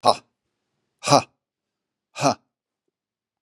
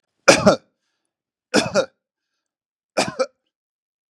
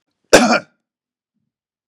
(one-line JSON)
{"exhalation_length": "3.4 s", "exhalation_amplitude": 32767, "exhalation_signal_mean_std_ratio": 0.23, "three_cough_length": "4.1 s", "three_cough_amplitude": 32768, "three_cough_signal_mean_std_ratio": 0.29, "cough_length": "1.9 s", "cough_amplitude": 32768, "cough_signal_mean_std_ratio": 0.28, "survey_phase": "beta (2021-08-13 to 2022-03-07)", "age": "65+", "gender": "Male", "wearing_mask": "No", "symptom_none": true, "smoker_status": "Ex-smoker", "respiratory_condition_asthma": false, "respiratory_condition_other": false, "recruitment_source": "REACT", "submission_delay": "3 days", "covid_test_result": "Negative", "covid_test_method": "RT-qPCR", "influenza_a_test_result": "Negative", "influenza_b_test_result": "Negative"}